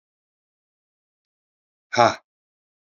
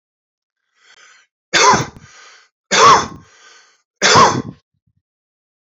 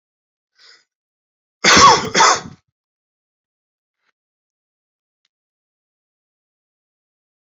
{
  "exhalation_length": "3.0 s",
  "exhalation_amplitude": 27957,
  "exhalation_signal_mean_std_ratio": 0.17,
  "three_cough_length": "5.7 s",
  "three_cough_amplitude": 32767,
  "three_cough_signal_mean_std_ratio": 0.36,
  "cough_length": "7.4 s",
  "cough_amplitude": 31667,
  "cough_signal_mean_std_ratio": 0.24,
  "survey_phase": "alpha (2021-03-01 to 2021-08-12)",
  "age": "45-64",
  "gender": "Male",
  "wearing_mask": "No",
  "symptom_cough_any": true,
  "symptom_abdominal_pain": true,
  "symptom_diarrhoea": true,
  "symptom_fatigue": true,
  "symptom_fever_high_temperature": true,
  "symptom_headache": true,
  "symptom_change_to_sense_of_smell_or_taste": true,
  "symptom_loss_of_taste": true,
  "symptom_onset": "7 days",
  "smoker_status": "Ex-smoker",
  "respiratory_condition_asthma": false,
  "respiratory_condition_other": false,
  "recruitment_source": "Test and Trace",
  "submission_delay": "1 day",
  "covid_test_result": "Positive",
  "covid_test_method": "RT-qPCR"
}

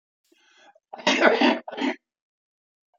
{
  "cough_length": "3.0 s",
  "cough_amplitude": 21592,
  "cough_signal_mean_std_ratio": 0.38,
  "survey_phase": "beta (2021-08-13 to 2022-03-07)",
  "age": "65+",
  "gender": "Male",
  "wearing_mask": "No",
  "symptom_none": true,
  "smoker_status": "Never smoked",
  "respiratory_condition_asthma": false,
  "respiratory_condition_other": false,
  "recruitment_source": "REACT",
  "submission_delay": "2 days",
  "covid_test_result": "Negative",
  "covid_test_method": "RT-qPCR",
  "influenza_a_test_result": "Negative",
  "influenza_b_test_result": "Negative"
}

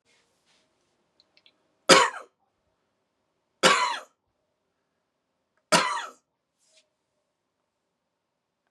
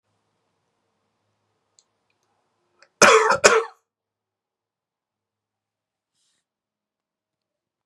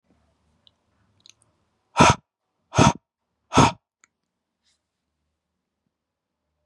{
  "three_cough_length": "8.7 s",
  "three_cough_amplitude": 27372,
  "three_cough_signal_mean_std_ratio": 0.22,
  "cough_length": "7.9 s",
  "cough_amplitude": 32768,
  "cough_signal_mean_std_ratio": 0.2,
  "exhalation_length": "6.7 s",
  "exhalation_amplitude": 30394,
  "exhalation_signal_mean_std_ratio": 0.21,
  "survey_phase": "beta (2021-08-13 to 2022-03-07)",
  "age": "18-44",
  "gender": "Male",
  "wearing_mask": "No",
  "symptom_none": true,
  "smoker_status": "Ex-smoker",
  "respiratory_condition_asthma": false,
  "respiratory_condition_other": false,
  "recruitment_source": "REACT",
  "submission_delay": "1 day",
  "covid_test_result": "Negative",
  "covid_test_method": "RT-qPCR",
  "influenza_a_test_result": "Negative",
  "influenza_b_test_result": "Negative"
}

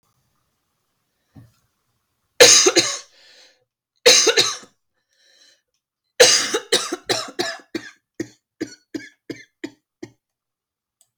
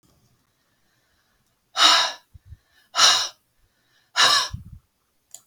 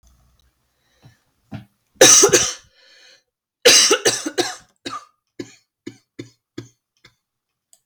{
  "three_cough_length": "11.2 s",
  "three_cough_amplitude": 32768,
  "three_cough_signal_mean_std_ratio": 0.3,
  "exhalation_length": "5.5 s",
  "exhalation_amplitude": 27241,
  "exhalation_signal_mean_std_ratio": 0.34,
  "cough_length": "7.9 s",
  "cough_amplitude": 32768,
  "cough_signal_mean_std_ratio": 0.3,
  "survey_phase": "alpha (2021-03-01 to 2021-08-12)",
  "age": "45-64",
  "gender": "Female",
  "wearing_mask": "No",
  "symptom_cough_any": true,
  "symptom_fever_high_temperature": true,
  "symptom_onset": "5 days",
  "smoker_status": "Never smoked",
  "respiratory_condition_asthma": false,
  "respiratory_condition_other": false,
  "recruitment_source": "Test and Trace",
  "submission_delay": "1 day",
  "covid_test_result": "Positive",
  "covid_test_method": "RT-qPCR",
  "covid_ct_value": 15.4,
  "covid_ct_gene": "ORF1ab gene",
  "covid_ct_mean": 16.6,
  "covid_viral_load": "3700000 copies/ml",
  "covid_viral_load_category": "High viral load (>1M copies/ml)"
}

